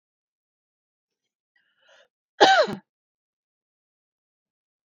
{"cough_length": "4.9 s", "cough_amplitude": 28089, "cough_signal_mean_std_ratio": 0.19, "survey_phase": "beta (2021-08-13 to 2022-03-07)", "age": "45-64", "gender": "Female", "wearing_mask": "No", "symptom_none": true, "smoker_status": "Ex-smoker", "respiratory_condition_asthma": false, "respiratory_condition_other": false, "recruitment_source": "REACT", "submission_delay": "1 day", "covid_test_result": "Negative", "covid_test_method": "RT-qPCR"}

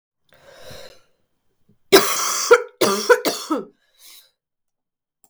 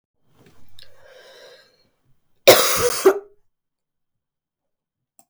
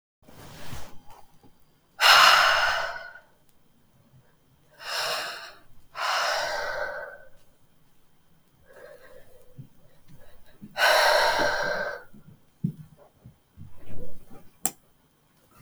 {"three_cough_length": "5.3 s", "three_cough_amplitude": 32768, "three_cough_signal_mean_std_ratio": 0.34, "cough_length": "5.3 s", "cough_amplitude": 32768, "cough_signal_mean_std_ratio": 0.27, "exhalation_length": "15.6 s", "exhalation_amplitude": 27048, "exhalation_signal_mean_std_ratio": 0.44, "survey_phase": "beta (2021-08-13 to 2022-03-07)", "age": "18-44", "gender": "Female", "wearing_mask": "No", "symptom_cough_any": true, "symptom_new_continuous_cough": true, "symptom_runny_or_blocked_nose": true, "symptom_shortness_of_breath": true, "symptom_sore_throat": true, "symptom_abdominal_pain": true, "symptom_fatigue": true, "symptom_headache": true, "symptom_change_to_sense_of_smell_or_taste": true, "symptom_loss_of_taste": true, "smoker_status": "Never smoked", "respiratory_condition_asthma": false, "respiratory_condition_other": false, "recruitment_source": "Test and Trace", "submission_delay": "2 days", "covid_test_result": "Positive", "covid_test_method": "LFT"}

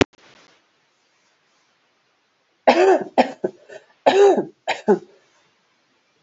{"three_cough_length": "6.2 s", "three_cough_amplitude": 29914, "three_cough_signal_mean_std_ratio": 0.33, "survey_phase": "beta (2021-08-13 to 2022-03-07)", "age": "45-64", "gender": "Female", "wearing_mask": "No", "symptom_cough_any": true, "symptom_runny_or_blocked_nose": true, "symptom_shortness_of_breath": true, "symptom_fatigue": true, "symptom_change_to_sense_of_smell_or_taste": true, "smoker_status": "Never smoked", "respiratory_condition_asthma": false, "respiratory_condition_other": false, "recruitment_source": "Test and Trace", "submission_delay": "2 days", "covid_test_result": "Positive", "covid_test_method": "RT-qPCR", "covid_ct_value": 13.6, "covid_ct_gene": "ORF1ab gene", "covid_ct_mean": 13.7, "covid_viral_load": "32000000 copies/ml", "covid_viral_load_category": "High viral load (>1M copies/ml)"}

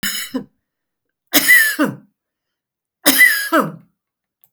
{"three_cough_length": "4.5 s", "three_cough_amplitude": 32768, "three_cough_signal_mean_std_ratio": 0.42, "survey_phase": "beta (2021-08-13 to 2022-03-07)", "age": "65+", "gender": "Female", "wearing_mask": "No", "symptom_none": true, "smoker_status": "Never smoked", "respiratory_condition_asthma": false, "respiratory_condition_other": false, "recruitment_source": "REACT", "submission_delay": "1 day", "covid_test_result": "Negative", "covid_test_method": "RT-qPCR"}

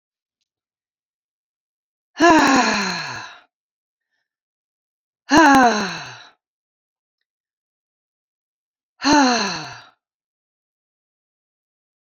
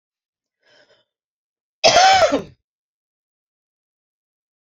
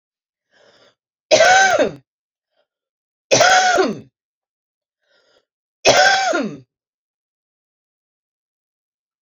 {"exhalation_length": "12.1 s", "exhalation_amplitude": 28480, "exhalation_signal_mean_std_ratio": 0.31, "cough_length": "4.7 s", "cough_amplitude": 29926, "cough_signal_mean_std_ratio": 0.28, "three_cough_length": "9.2 s", "three_cough_amplitude": 32768, "three_cough_signal_mean_std_ratio": 0.37, "survey_phase": "beta (2021-08-13 to 2022-03-07)", "age": "45-64", "gender": "Female", "wearing_mask": "No", "symptom_cough_any": true, "symptom_abdominal_pain": true, "symptom_fatigue": true, "symptom_headache": true, "symptom_change_to_sense_of_smell_or_taste": true, "symptom_other": true, "symptom_onset": "5 days", "smoker_status": "Ex-smoker", "respiratory_condition_asthma": true, "respiratory_condition_other": false, "recruitment_source": "Test and Trace", "submission_delay": "2 days", "covid_test_result": "Positive", "covid_test_method": "RT-qPCR", "covid_ct_value": 14.4, "covid_ct_gene": "ORF1ab gene", "covid_ct_mean": 14.7, "covid_viral_load": "15000000 copies/ml", "covid_viral_load_category": "High viral load (>1M copies/ml)"}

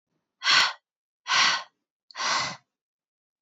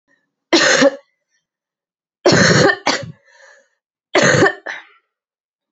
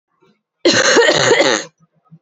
{"exhalation_length": "3.4 s", "exhalation_amplitude": 14110, "exhalation_signal_mean_std_ratio": 0.42, "three_cough_length": "5.7 s", "three_cough_amplitude": 32227, "three_cough_signal_mean_std_ratio": 0.43, "cough_length": "2.2 s", "cough_amplitude": 30925, "cough_signal_mean_std_ratio": 0.58, "survey_phase": "alpha (2021-03-01 to 2021-08-12)", "age": "18-44", "gender": "Female", "wearing_mask": "No", "symptom_cough_any": true, "symptom_new_continuous_cough": true, "symptom_fatigue": true, "symptom_fever_high_temperature": true, "symptom_change_to_sense_of_smell_or_taste": true, "symptom_loss_of_taste": true, "symptom_onset": "4 days", "smoker_status": "Never smoked", "respiratory_condition_asthma": false, "respiratory_condition_other": false, "recruitment_source": "Test and Trace", "submission_delay": "3 days", "covid_test_result": "Positive", "covid_test_method": "RT-qPCR"}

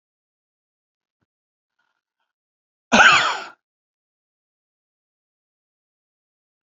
{"cough_length": "6.7 s", "cough_amplitude": 31417, "cough_signal_mean_std_ratio": 0.19, "survey_phase": "alpha (2021-03-01 to 2021-08-12)", "age": "65+", "gender": "Male", "wearing_mask": "No", "symptom_none": true, "smoker_status": "Ex-smoker", "respiratory_condition_asthma": false, "respiratory_condition_other": false, "recruitment_source": "REACT", "submission_delay": "2 days", "covid_test_result": "Negative", "covid_test_method": "RT-qPCR"}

